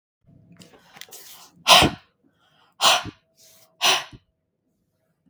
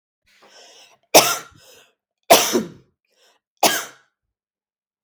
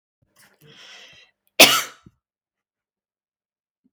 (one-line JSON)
{"exhalation_length": "5.3 s", "exhalation_amplitude": 32768, "exhalation_signal_mean_std_ratio": 0.28, "three_cough_length": "5.0 s", "three_cough_amplitude": 32768, "three_cough_signal_mean_std_ratio": 0.27, "cough_length": "3.9 s", "cough_amplitude": 32768, "cough_signal_mean_std_ratio": 0.18, "survey_phase": "beta (2021-08-13 to 2022-03-07)", "age": "45-64", "gender": "Female", "wearing_mask": "No", "symptom_fatigue": true, "symptom_onset": "13 days", "smoker_status": "Ex-smoker", "respiratory_condition_asthma": false, "respiratory_condition_other": false, "recruitment_source": "REACT", "submission_delay": "2 days", "covid_test_result": "Negative", "covid_test_method": "RT-qPCR"}